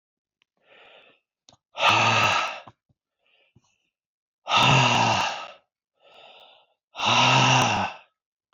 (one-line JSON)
{"exhalation_length": "8.5 s", "exhalation_amplitude": 20597, "exhalation_signal_mean_std_ratio": 0.47, "survey_phase": "beta (2021-08-13 to 2022-03-07)", "age": "45-64", "gender": "Male", "wearing_mask": "No", "symptom_runny_or_blocked_nose": true, "symptom_sore_throat": true, "symptom_headache": true, "symptom_other": true, "smoker_status": "Never smoked", "respiratory_condition_asthma": false, "respiratory_condition_other": false, "recruitment_source": "Test and Trace", "submission_delay": "1 day", "covid_test_result": "Positive", "covid_test_method": "ePCR"}